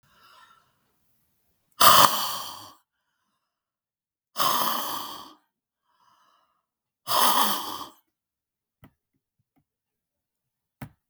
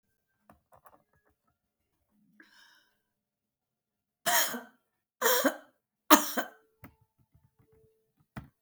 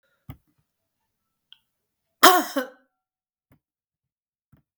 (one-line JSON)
{"exhalation_length": "11.1 s", "exhalation_amplitude": 32766, "exhalation_signal_mean_std_ratio": 0.29, "three_cough_length": "8.6 s", "three_cough_amplitude": 29191, "three_cough_signal_mean_std_ratio": 0.23, "cough_length": "4.8 s", "cough_amplitude": 32768, "cough_signal_mean_std_ratio": 0.17, "survey_phase": "beta (2021-08-13 to 2022-03-07)", "age": "65+", "gender": "Female", "wearing_mask": "No", "symptom_runny_or_blocked_nose": true, "symptom_headache": true, "symptom_onset": "13 days", "smoker_status": "Ex-smoker", "respiratory_condition_asthma": false, "respiratory_condition_other": false, "recruitment_source": "REACT", "submission_delay": "4 days", "covid_test_result": "Negative", "covid_test_method": "RT-qPCR", "influenza_a_test_result": "Negative", "influenza_b_test_result": "Negative"}